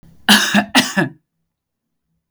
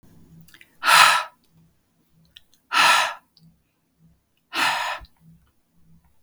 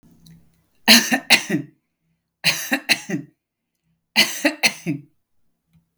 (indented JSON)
{
  "cough_length": "2.3 s",
  "cough_amplitude": 32768,
  "cough_signal_mean_std_ratio": 0.41,
  "exhalation_length": "6.2 s",
  "exhalation_amplitude": 32768,
  "exhalation_signal_mean_std_ratio": 0.34,
  "three_cough_length": "6.0 s",
  "three_cough_amplitude": 32768,
  "three_cough_signal_mean_std_ratio": 0.35,
  "survey_phase": "beta (2021-08-13 to 2022-03-07)",
  "age": "45-64",
  "gender": "Female",
  "wearing_mask": "No",
  "symptom_none": true,
  "smoker_status": "Prefer not to say",
  "respiratory_condition_asthma": false,
  "respiratory_condition_other": false,
  "recruitment_source": "REACT",
  "submission_delay": "1 day",
  "covid_test_result": "Negative",
  "covid_test_method": "RT-qPCR",
  "influenza_a_test_result": "Unknown/Void",
  "influenza_b_test_result": "Unknown/Void"
}